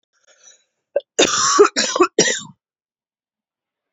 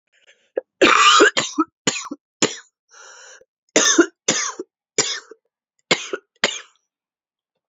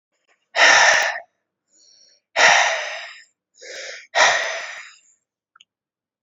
{"cough_length": "3.9 s", "cough_amplitude": 31189, "cough_signal_mean_std_ratio": 0.38, "three_cough_length": "7.7 s", "three_cough_amplitude": 30965, "three_cough_signal_mean_std_ratio": 0.37, "exhalation_length": "6.2 s", "exhalation_amplitude": 31293, "exhalation_signal_mean_std_ratio": 0.42, "survey_phase": "beta (2021-08-13 to 2022-03-07)", "age": "18-44", "gender": "Female", "wearing_mask": "No", "symptom_cough_any": true, "symptom_runny_or_blocked_nose": true, "symptom_sore_throat": true, "symptom_abdominal_pain": true, "symptom_diarrhoea": true, "symptom_fatigue": true, "symptom_fever_high_temperature": true, "symptom_headache": true, "symptom_onset": "2 days", "smoker_status": "Never smoked", "respiratory_condition_asthma": false, "respiratory_condition_other": false, "recruitment_source": "Test and Trace", "submission_delay": "1 day", "covid_test_result": "Positive", "covid_test_method": "RT-qPCR", "covid_ct_value": 15.8, "covid_ct_gene": "ORF1ab gene", "covid_ct_mean": 15.9, "covid_viral_load": "6300000 copies/ml", "covid_viral_load_category": "High viral load (>1M copies/ml)"}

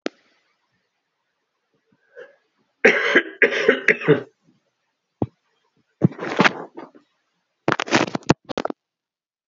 {"three_cough_length": "9.5 s", "three_cough_amplitude": 32768, "three_cough_signal_mean_std_ratio": 0.3, "survey_phase": "beta (2021-08-13 to 2022-03-07)", "age": "18-44", "gender": "Male", "wearing_mask": "No", "symptom_cough_any": true, "symptom_new_continuous_cough": true, "symptom_runny_or_blocked_nose": true, "symptom_onset": "14 days", "smoker_status": "Never smoked", "respiratory_condition_asthma": false, "respiratory_condition_other": false, "recruitment_source": "Test and Trace", "submission_delay": "1 day", "covid_test_result": "Positive", "covid_test_method": "RT-qPCR"}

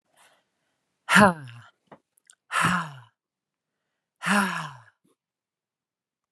{"exhalation_length": "6.3 s", "exhalation_amplitude": 27580, "exhalation_signal_mean_std_ratio": 0.29, "survey_phase": "alpha (2021-03-01 to 2021-08-12)", "age": "45-64", "gender": "Female", "wearing_mask": "No", "symptom_none": true, "smoker_status": "Never smoked", "respiratory_condition_asthma": false, "respiratory_condition_other": false, "recruitment_source": "REACT", "submission_delay": "1 day", "covid_test_result": "Negative", "covid_test_method": "RT-qPCR"}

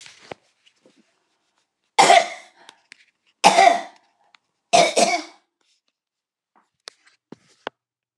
{"three_cough_length": "8.2 s", "three_cough_amplitude": 29204, "three_cough_signal_mean_std_ratio": 0.28, "survey_phase": "beta (2021-08-13 to 2022-03-07)", "age": "65+", "gender": "Female", "wearing_mask": "No", "symptom_none": true, "smoker_status": "Never smoked", "respiratory_condition_asthma": true, "respiratory_condition_other": false, "recruitment_source": "REACT", "submission_delay": "10 days", "covid_test_result": "Negative", "covid_test_method": "RT-qPCR"}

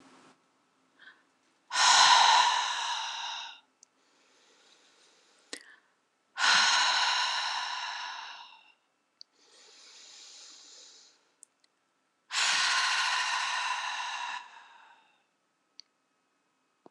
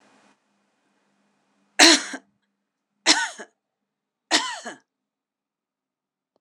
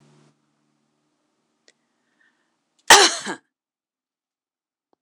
{"exhalation_length": "16.9 s", "exhalation_amplitude": 12105, "exhalation_signal_mean_std_ratio": 0.44, "three_cough_length": "6.4 s", "three_cough_amplitude": 26028, "three_cough_signal_mean_std_ratio": 0.23, "cough_length": "5.0 s", "cough_amplitude": 26028, "cough_signal_mean_std_ratio": 0.17, "survey_phase": "beta (2021-08-13 to 2022-03-07)", "age": "45-64", "gender": "Female", "wearing_mask": "No", "symptom_none": true, "smoker_status": "Ex-smoker", "respiratory_condition_asthma": false, "respiratory_condition_other": false, "recruitment_source": "REACT", "submission_delay": "1 day", "covid_test_result": "Negative", "covid_test_method": "RT-qPCR"}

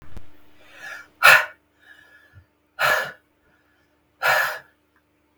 {"exhalation_length": "5.4 s", "exhalation_amplitude": 32768, "exhalation_signal_mean_std_ratio": 0.33, "survey_phase": "beta (2021-08-13 to 2022-03-07)", "age": "45-64", "gender": "Female", "wearing_mask": "No", "symptom_none": true, "symptom_onset": "13 days", "smoker_status": "Ex-smoker", "respiratory_condition_asthma": false, "respiratory_condition_other": false, "recruitment_source": "REACT", "submission_delay": "9 days", "covid_test_result": "Negative", "covid_test_method": "RT-qPCR"}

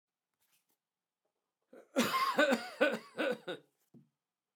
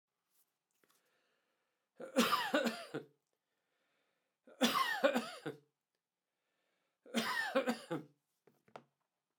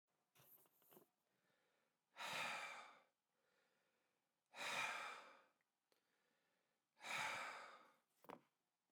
{"cough_length": "4.6 s", "cough_amplitude": 6643, "cough_signal_mean_std_ratio": 0.39, "three_cough_length": "9.4 s", "three_cough_amplitude": 4936, "three_cough_signal_mean_std_ratio": 0.36, "exhalation_length": "8.9 s", "exhalation_amplitude": 688, "exhalation_signal_mean_std_ratio": 0.42, "survey_phase": "beta (2021-08-13 to 2022-03-07)", "age": "45-64", "gender": "Male", "wearing_mask": "No", "symptom_none": true, "smoker_status": "Never smoked", "respiratory_condition_asthma": false, "respiratory_condition_other": false, "recruitment_source": "REACT", "submission_delay": "2 days", "covid_test_result": "Negative", "covid_test_method": "RT-qPCR"}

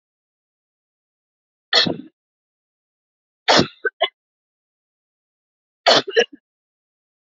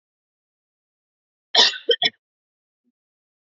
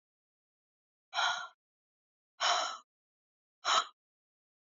{"three_cough_length": "7.3 s", "three_cough_amplitude": 28823, "three_cough_signal_mean_std_ratio": 0.25, "cough_length": "3.4 s", "cough_amplitude": 27735, "cough_signal_mean_std_ratio": 0.23, "exhalation_length": "4.8 s", "exhalation_amplitude": 6171, "exhalation_signal_mean_std_ratio": 0.32, "survey_phase": "alpha (2021-03-01 to 2021-08-12)", "age": "18-44", "gender": "Female", "wearing_mask": "No", "symptom_none": true, "smoker_status": "Never smoked", "respiratory_condition_asthma": false, "respiratory_condition_other": false, "recruitment_source": "REACT", "submission_delay": "5 days", "covid_test_result": "Negative", "covid_test_method": "RT-qPCR"}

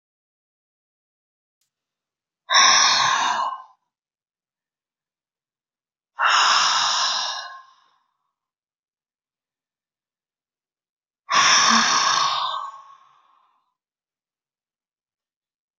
{"exhalation_length": "15.8 s", "exhalation_amplitude": 27050, "exhalation_signal_mean_std_ratio": 0.39, "survey_phase": "beta (2021-08-13 to 2022-03-07)", "age": "45-64", "gender": "Female", "wearing_mask": "No", "symptom_none": true, "smoker_status": "Never smoked", "respiratory_condition_asthma": true, "respiratory_condition_other": false, "recruitment_source": "REACT", "submission_delay": "3 days", "covid_test_result": "Negative", "covid_test_method": "RT-qPCR"}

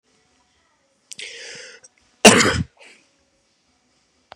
{"cough_length": "4.4 s", "cough_amplitude": 32768, "cough_signal_mean_std_ratio": 0.23, "survey_phase": "beta (2021-08-13 to 2022-03-07)", "age": "45-64", "gender": "Male", "wearing_mask": "No", "symptom_cough_any": true, "symptom_runny_or_blocked_nose": true, "symptom_sore_throat": true, "symptom_headache": true, "smoker_status": "Never smoked", "respiratory_condition_asthma": false, "respiratory_condition_other": false, "recruitment_source": "Test and Trace", "submission_delay": "1 day", "covid_test_result": "Positive", "covid_test_method": "RT-qPCR", "covid_ct_value": 18.1, "covid_ct_gene": "ORF1ab gene", "covid_ct_mean": 18.6, "covid_viral_load": "810000 copies/ml", "covid_viral_load_category": "Low viral load (10K-1M copies/ml)"}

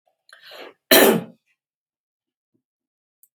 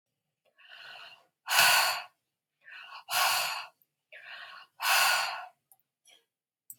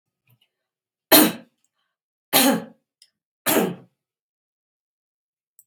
{"cough_length": "3.3 s", "cough_amplitude": 32767, "cough_signal_mean_std_ratio": 0.24, "exhalation_length": "6.8 s", "exhalation_amplitude": 19675, "exhalation_signal_mean_std_ratio": 0.42, "three_cough_length": "5.7 s", "three_cough_amplitude": 32768, "three_cough_signal_mean_std_ratio": 0.27, "survey_phase": "beta (2021-08-13 to 2022-03-07)", "age": "65+", "gender": "Female", "wearing_mask": "No", "symptom_none": true, "smoker_status": "Never smoked", "respiratory_condition_asthma": false, "respiratory_condition_other": false, "recruitment_source": "REACT", "submission_delay": "2 days", "covid_test_result": "Negative", "covid_test_method": "RT-qPCR", "influenza_a_test_result": "Negative", "influenza_b_test_result": "Negative"}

